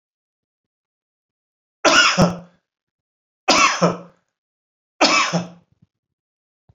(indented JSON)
{
  "three_cough_length": "6.7 s",
  "three_cough_amplitude": 29522,
  "three_cough_signal_mean_std_ratio": 0.35,
  "survey_phase": "beta (2021-08-13 to 2022-03-07)",
  "age": "45-64",
  "gender": "Male",
  "wearing_mask": "No",
  "symptom_none": true,
  "smoker_status": "Never smoked",
  "respiratory_condition_asthma": false,
  "respiratory_condition_other": false,
  "recruitment_source": "REACT",
  "submission_delay": "4 days",
  "covid_test_result": "Negative",
  "covid_test_method": "RT-qPCR"
}